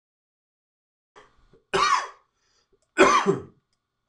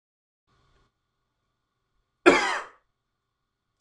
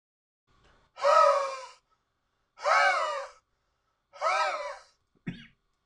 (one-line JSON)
{"three_cough_length": "4.1 s", "three_cough_amplitude": 24907, "three_cough_signal_mean_std_ratio": 0.33, "cough_length": "3.8 s", "cough_amplitude": 24139, "cough_signal_mean_std_ratio": 0.2, "exhalation_length": "5.9 s", "exhalation_amplitude": 11801, "exhalation_signal_mean_std_ratio": 0.42, "survey_phase": "beta (2021-08-13 to 2022-03-07)", "age": "18-44", "gender": "Male", "wearing_mask": "No", "symptom_cough_any": true, "symptom_runny_or_blocked_nose": true, "symptom_fatigue": true, "smoker_status": "Never smoked", "respiratory_condition_asthma": false, "respiratory_condition_other": false, "recruitment_source": "REACT", "submission_delay": "3 days", "covid_test_result": "Negative", "covid_test_method": "RT-qPCR", "influenza_a_test_result": "Negative", "influenza_b_test_result": "Negative"}